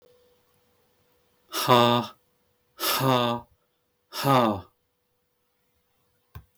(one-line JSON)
{"exhalation_length": "6.6 s", "exhalation_amplitude": 19298, "exhalation_signal_mean_std_ratio": 0.35, "survey_phase": "beta (2021-08-13 to 2022-03-07)", "age": "45-64", "gender": "Male", "wearing_mask": "No", "symptom_none": true, "smoker_status": "Never smoked", "respiratory_condition_asthma": false, "respiratory_condition_other": false, "recruitment_source": "REACT", "submission_delay": "1 day", "covid_test_result": "Negative", "covid_test_method": "RT-qPCR"}